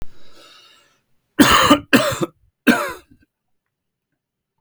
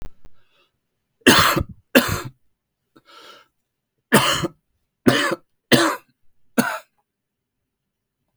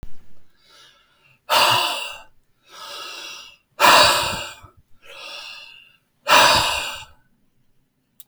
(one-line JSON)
{"cough_length": "4.6 s", "cough_amplitude": 32768, "cough_signal_mean_std_ratio": 0.36, "three_cough_length": "8.4 s", "three_cough_amplitude": 32768, "three_cough_signal_mean_std_ratio": 0.33, "exhalation_length": "8.3 s", "exhalation_amplitude": 32712, "exhalation_signal_mean_std_ratio": 0.42, "survey_phase": "beta (2021-08-13 to 2022-03-07)", "age": "18-44", "gender": "Male", "wearing_mask": "No", "symptom_cough_any": true, "symptom_shortness_of_breath": true, "symptom_sore_throat": true, "symptom_fatigue": true, "symptom_onset": "5 days", "smoker_status": "Never smoked", "respiratory_condition_asthma": false, "respiratory_condition_other": false, "recruitment_source": "REACT", "submission_delay": "0 days", "covid_test_result": "Positive", "covid_test_method": "RT-qPCR", "covid_ct_value": 24.3, "covid_ct_gene": "E gene", "influenza_a_test_result": "Negative", "influenza_b_test_result": "Negative"}